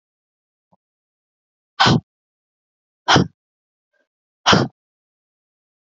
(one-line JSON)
{"exhalation_length": "5.8 s", "exhalation_amplitude": 30847, "exhalation_signal_mean_std_ratio": 0.24, "survey_phase": "beta (2021-08-13 to 2022-03-07)", "age": "18-44", "gender": "Female", "wearing_mask": "No", "symptom_cough_any": true, "symptom_runny_or_blocked_nose": true, "symptom_sore_throat": true, "symptom_onset": "5 days", "smoker_status": "Ex-smoker", "respiratory_condition_asthma": false, "respiratory_condition_other": false, "recruitment_source": "Test and Trace", "submission_delay": "1 day", "covid_test_result": "Positive", "covid_test_method": "RT-qPCR", "covid_ct_value": 26.2, "covid_ct_gene": "ORF1ab gene", "covid_ct_mean": 26.8, "covid_viral_load": "1600 copies/ml", "covid_viral_load_category": "Minimal viral load (< 10K copies/ml)"}